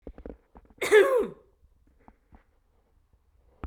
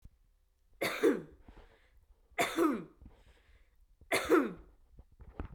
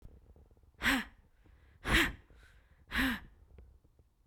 cough_length: 3.7 s
cough_amplitude: 13455
cough_signal_mean_std_ratio: 0.29
three_cough_length: 5.5 s
three_cough_amplitude: 5077
three_cough_signal_mean_std_ratio: 0.39
exhalation_length: 4.3 s
exhalation_amplitude: 5515
exhalation_signal_mean_std_ratio: 0.37
survey_phase: beta (2021-08-13 to 2022-03-07)
age: 18-44
gender: Female
wearing_mask: 'No'
symptom_other: true
smoker_status: Never smoked
respiratory_condition_asthma: false
respiratory_condition_other: false
recruitment_source: Test and Trace
submission_delay: 2 days
covid_test_result: Positive
covid_test_method: RT-qPCR
covid_ct_value: 16.1
covid_ct_gene: ORF1ab gene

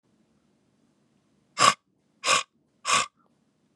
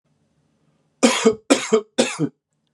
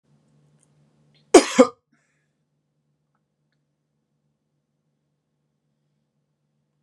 exhalation_length: 3.8 s
exhalation_amplitude: 26743
exhalation_signal_mean_std_ratio: 0.28
three_cough_length: 2.7 s
three_cough_amplitude: 31188
three_cough_signal_mean_std_ratio: 0.39
cough_length: 6.8 s
cough_amplitude: 32767
cough_signal_mean_std_ratio: 0.13
survey_phase: beta (2021-08-13 to 2022-03-07)
age: 18-44
gender: Male
wearing_mask: 'No'
symptom_runny_or_blocked_nose: true
smoker_status: Never smoked
respiratory_condition_asthma: false
respiratory_condition_other: false
recruitment_source: Test and Trace
submission_delay: 2 days
covid_test_result: Positive
covid_test_method: RT-qPCR
covid_ct_value: 25.1
covid_ct_gene: ORF1ab gene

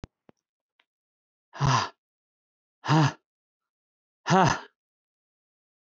exhalation_length: 6.0 s
exhalation_amplitude: 16672
exhalation_signal_mean_std_ratio: 0.28
survey_phase: alpha (2021-03-01 to 2021-08-12)
age: 65+
gender: Male
wearing_mask: 'No'
symptom_none: true
smoker_status: Never smoked
respiratory_condition_asthma: false
respiratory_condition_other: false
recruitment_source: REACT
submission_delay: 2 days
covid_test_result: Negative
covid_test_method: RT-qPCR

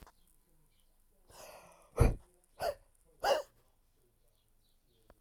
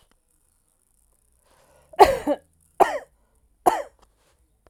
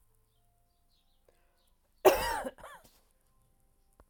exhalation_length: 5.2 s
exhalation_amplitude: 8263
exhalation_signal_mean_std_ratio: 0.25
three_cough_length: 4.7 s
three_cough_amplitude: 32767
three_cough_signal_mean_std_ratio: 0.23
cough_length: 4.1 s
cough_amplitude: 13276
cough_signal_mean_std_ratio: 0.22
survey_phase: alpha (2021-03-01 to 2021-08-12)
age: 45-64
gender: Female
wearing_mask: 'No'
symptom_none: true
smoker_status: Never smoked
respiratory_condition_asthma: false
respiratory_condition_other: false
recruitment_source: REACT
submission_delay: 1 day
covid_test_result: Negative
covid_test_method: RT-qPCR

